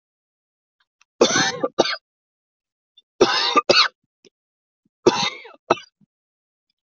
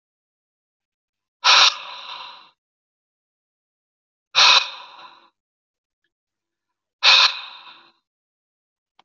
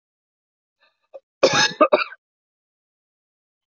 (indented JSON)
{
  "three_cough_length": "6.8 s",
  "three_cough_amplitude": 32767,
  "three_cough_signal_mean_std_ratio": 0.33,
  "exhalation_length": "9.0 s",
  "exhalation_amplitude": 29513,
  "exhalation_signal_mean_std_ratio": 0.27,
  "cough_length": "3.7 s",
  "cough_amplitude": 24141,
  "cough_signal_mean_std_ratio": 0.26,
  "survey_phase": "beta (2021-08-13 to 2022-03-07)",
  "age": "18-44",
  "gender": "Male",
  "wearing_mask": "No",
  "symptom_none": true,
  "smoker_status": "Never smoked",
  "respiratory_condition_asthma": false,
  "respiratory_condition_other": false,
  "recruitment_source": "REACT",
  "submission_delay": "3 days",
  "covid_test_result": "Negative",
  "covid_test_method": "RT-qPCR"
}